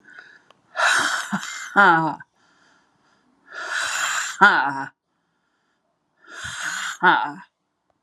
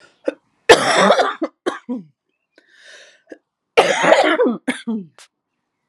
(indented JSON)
{
  "exhalation_length": "8.0 s",
  "exhalation_amplitude": 31812,
  "exhalation_signal_mean_std_ratio": 0.44,
  "cough_length": "5.9 s",
  "cough_amplitude": 32768,
  "cough_signal_mean_std_ratio": 0.43,
  "survey_phase": "alpha (2021-03-01 to 2021-08-12)",
  "age": "45-64",
  "gender": "Female",
  "wearing_mask": "No",
  "symptom_cough_any": true,
  "symptom_fatigue": true,
  "symptom_fever_high_temperature": true,
  "symptom_headache": true,
  "symptom_change_to_sense_of_smell_or_taste": true,
  "symptom_onset": "32 days",
  "smoker_status": "Never smoked",
  "respiratory_condition_asthma": false,
  "respiratory_condition_other": false,
  "recruitment_source": "Test and Trace",
  "submission_delay": "31 days",
  "covid_test_result": "Negative",
  "covid_test_method": "RT-qPCR"
}